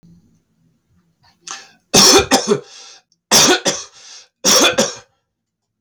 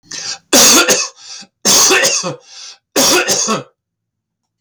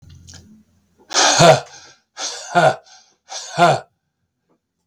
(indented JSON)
{
  "three_cough_length": "5.8 s",
  "three_cough_amplitude": 32768,
  "three_cough_signal_mean_std_ratio": 0.42,
  "cough_length": "4.6 s",
  "cough_amplitude": 32766,
  "cough_signal_mean_std_ratio": 0.61,
  "exhalation_length": "4.9 s",
  "exhalation_amplitude": 32766,
  "exhalation_signal_mean_std_ratio": 0.38,
  "survey_phase": "beta (2021-08-13 to 2022-03-07)",
  "age": "65+",
  "gender": "Male",
  "wearing_mask": "No",
  "symptom_none": true,
  "smoker_status": "Ex-smoker",
  "respiratory_condition_asthma": false,
  "respiratory_condition_other": false,
  "recruitment_source": "REACT",
  "submission_delay": "2 days",
  "covid_test_result": "Negative",
  "covid_test_method": "RT-qPCR",
  "influenza_a_test_result": "Negative",
  "influenza_b_test_result": "Negative"
}